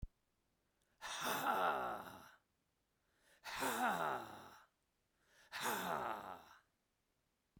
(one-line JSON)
{"exhalation_length": "7.6 s", "exhalation_amplitude": 2219, "exhalation_signal_mean_std_ratio": 0.49, "survey_phase": "beta (2021-08-13 to 2022-03-07)", "age": "45-64", "gender": "Male", "wearing_mask": "No", "symptom_none": true, "smoker_status": "Never smoked", "respiratory_condition_asthma": false, "respiratory_condition_other": false, "recruitment_source": "REACT", "submission_delay": "3 days", "covid_test_result": "Negative", "covid_test_method": "RT-qPCR"}